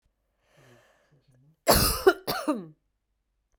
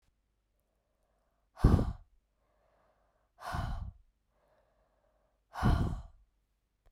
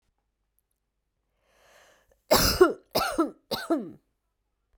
{"cough_length": "3.6 s", "cough_amplitude": 21936, "cough_signal_mean_std_ratio": 0.31, "exhalation_length": "6.9 s", "exhalation_amplitude": 11189, "exhalation_signal_mean_std_ratio": 0.28, "three_cough_length": "4.8 s", "three_cough_amplitude": 16200, "three_cough_signal_mean_std_ratio": 0.33, "survey_phase": "beta (2021-08-13 to 2022-03-07)", "age": "18-44", "gender": "Female", "wearing_mask": "No", "symptom_cough_any": true, "symptom_runny_or_blocked_nose": true, "symptom_onset": "12 days", "smoker_status": "Ex-smoker", "respiratory_condition_asthma": false, "respiratory_condition_other": false, "recruitment_source": "REACT", "submission_delay": "1 day", "covid_test_result": "Negative", "covid_test_method": "RT-qPCR"}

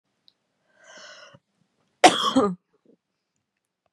{"cough_length": "3.9 s", "cough_amplitude": 32513, "cough_signal_mean_std_ratio": 0.24, "survey_phase": "beta (2021-08-13 to 2022-03-07)", "age": "18-44", "gender": "Female", "wearing_mask": "No", "symptom_cough_any": true, "symptom_new_continuous_cough": true, "symptom_runny_or_blocked_nose": true, "symptom_sore_throat": true, "symptom_fatigue": true, "symptom_fever_high_temperature": true, "symptom_headache": true, "symptom_onset": "3 days", "smoker_status": "Never smoked", "respiratory_condition_asthma": false, "respiratory_condition_other": false, "recruitment_source": "Test and Trace", "submission_delay": "2 days", "covid_test_result": "Positive", "covid_test_method": "RT-qPCR"}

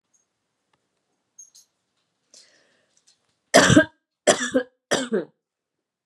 {"three_cough_length": "6.1 s", "three_cough_amplitude": 30901, "three_cough_signal_mean_std_ratio": 0.26, "survey_phase": "beta (2021-08-13 to 2022-03-07)", "age": "18-44", "gender": "Female", "wearing_mask": "No", "symptom_fatigue": true, "symptom_headache": true, "symptom_onset": "12 days", "smoker_status": "Never smoked", "respiratory_condition_asthma": false, "respiratory_condition_other": false, "recruitment_source": "REACT", "submission_delay": "1 day", "covid_test_result": "Negative", "covid_test_method": "RT-qPCR"}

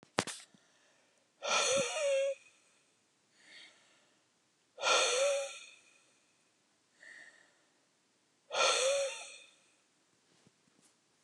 {"exhalation_length": "11.2 s", "exhalation_amplitude": 13478, "exhalation_signal_mean_std_ratio": 0.41, "survey_phase": "beta (2021-08-13 to 2022-03-07)", "age": "45-64", "gender": "Female", "wearing_mask": "No", "symptom_none": true, "smoker_status": "Never smoked", "respiratory_condition_asthma": false, "respiratory_condition_other": false, "recruitment_source": "REACT", "submission_delay": "1 day", "covid_test_result": "Negative", "covid_test_method": "RT-qPCR", "influenza_a_test_result": "Unknown/Void", "influenza_b_test_result": "Unknown/Void"}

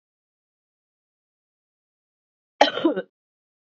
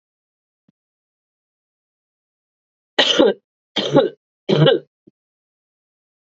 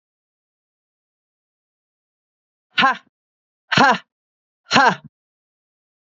{"cough_length": "3.7 s", "cough_amplitude": 27135, "cough_signal_mean_std_ratio": 0.2, "three_cough_length": "6.3 s", "three_cough_amplitude": 30431, "three_cough_signal_mean_std_ratio": 0.3, "exhalation_length": "6.1 s", "exhalation_amplitude": 28981, "exhalation_signal_mean_std_ratio": 0.25, "survey_phase": "beta (2021-08-13 to 2022-03-07)", "age": "45-64", "gender": "Female", "wearing_mask": "No", "symptom_cough_any": true, "symptom_runny_or_blocked_nose": true, "symptom_shortness_of_breath": true, "symptom_sore_throat": true, "symptom_onset": "2 days", "smoker_status": "Ex-smoker", "respiratory_condition_asthma": false, "respiratory_condition_other": false, "recruitment_source": "Test and Trace", "submission_delay": "1 day", "covid_test_result": "Positive", "covid_test_method": "RT-qPCR"}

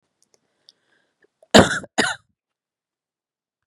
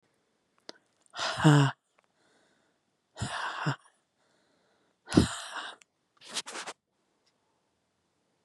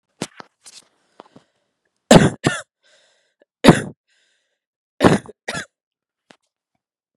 {"cough_length": "3.7 s", "cough_amplitude": 32768, "cough_signal_mean_std_ratio": 0.2, "exhalation_length": "8.4 s", "exhalation_amplitude": 18145, "exhalation_signal_mean_std_ratio": 0.27, "three_cough_length": "7.2 s", "three_cough_amplitude": 32768, "three_cough_signal_mean_std_ratio": 0.22, "survey_phase": "beta (2021-08-13 to 2022-03-07)", "age": "18-44", "gender": "Female", "wearing_mask": "No", "symptom_cough_any": true, "symptom_new_continuous_cough": true, "symptom_runny_or_blocked_nose": true, "symptom_shortness_of_breath": true, "symptom_sore_throat": true, "symptom_abdominal_pain": true, "symptom_diarrhoea": true, "symptom_fatigue": true, "symptom_fever_high_temperature": true, "symptom_headache": true, "symptom_other": true, "symptom_onset": "5 days", "smoker_status": "Ex-smoker", "respiratory_condition_asthma": false, "respiratory_condition_other": false, "recruitment_source": "Test and Trace", "submission_delay": "1 day", "covid_test_result": "Positive", "covid_test_method": "RT-qPCR", "covid_ct_value": 22.3, "covid_ct_gene": "N gene"}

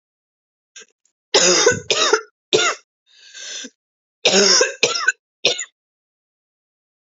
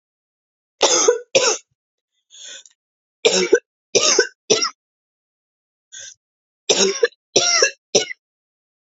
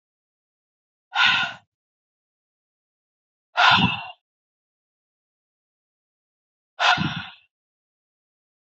{"cough_length": "7.1 s", "cough_amplitude": 30661, "cough_signal_mean_std_ratio": 0.42, "three_cough_length": "8.9 s", "three_cough_amplitude": 32767, "three_cough_signal_mean_std_ratio": 0.39, "exhalation_length": "8.8 s", "exhalation_amplitude": 22834, "exhalation_signal_mean_std_ratio": 0.28, "survey_phase": "alpha (2021-03-01 to 2021-08-12)", "age": "18-44", "gender": "Female", "wearing_mask": "No", "symptom_cough_any": true, "symptom_new_continuous_cough": true, "symptom_abdominal_pain": true, "symptom_fever_high_temperature": true, "symptom_headache": true, "symptom_change_to_sense_of_smell_or_taste": true, "symptom_loss_of_taste": true, "symptom_onset": "5 days", "smoker_status": "Ex-smoker", "respiratory_condition_asthma": false, "respiratory_condition_other": false, "recruitment_source": "Test and Trace", "submission_delay": "1 day", "covid_test_result": "Positive", "covid_test_method": "RT-qPCR", "covid_ct_value": 12.0, "covid_ct_gene": "ORF1ab gene", "covid_ct_mean": 12.8, "covid_viral_load": "63000000 copies/ml", "covid_viral_load_category": "High viral load (>1M copies/ml)"}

